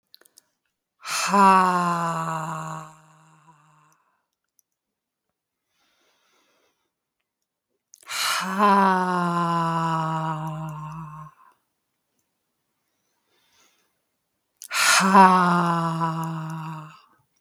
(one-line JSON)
{"exhalation_length": "17.4 s", "exhalation_amplitude": 31135, "exhalation_signal_mean_std_ratio": 0.44, "survey_phase": "beta (2021-08-13 to 2022-03-07)", "age": "45-64", "gender": "Female", "wearing_mask": "No", "symptom_runny_or_blocked_nose": true, "symptom_fatigue": true, "smoker_status": "Ex-smoker", "respiratory_condition_asthma": false, "respiratory_condition_other": true, "recruitment_source": "REACT", "submission_delay": "3 days", "covid_test_result": "Negative", "covid_test_method": "RT-qPCR"}